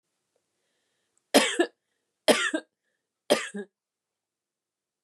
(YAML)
three_cough_length: 5.0 s
three_cough_amplitude: 19656
three_cough_signal_mean_std_ratio: 0.27
survey_phase: beta (2021-08-13 to 2022-03-07)
age: 45-64
gender: Female
wearing_mask: 'No'
symptom_cough_any: true
symptom_onset: 8 days
smoker_status: Never smoked
respiratory_condition_asthma: false
respiratory_condition_other: false
recruitment_source: REACT
submission_delay: 2 days
covid_test_result: Negative
covid_test_method: RT-qPCR
influenza_a_test_result: Negative
influenza_b_test_result: Negative